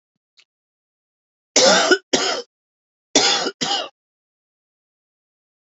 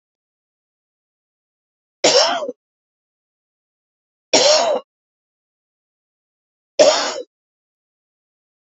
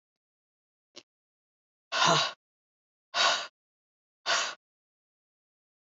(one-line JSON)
{"cough_length": "5.6 s", "cough_amplitude": 30373, "cough_signal_mean_std_ratio": 0.36, "three_cough_length": "8.8 s", "three_cough_amplitude": 30852, "three_cough_signal_mean_std_ratio": 0.29, "exhalation_length": "6.0 s", "exhalation_amplitude": 10941, "exhalation_signal_mean_std_ratio": 0.3, "survey_phase": "beta (2021-08-13 to 2022-03-07)", "age": "65+", "gender": "Female", "wearing_mask": "No", "symptom_cough_any": true, "symptom_runny_or_blocked_nose": true, "symptom_sore_throat": true, "symptom_fatigue": true, "smoker_status": "Never smoked", "respiratory_condition_asthma": false, "respiratory_condition_other": false, "recruitment_source": "Test and Trace", "submission_delay": "1 day", "covid_test_result": "Positive", "covid_test_method": "RT-qPCR", "covid_ct_value": 28.0, "covid_ct_gene": "ORF1ab gene", "covid_ct_mean": 28.4, "covid_viral_load": "480 copies/ml", "covid_viral_load_category": "Minimal viral load (< 10K copies/ml)"}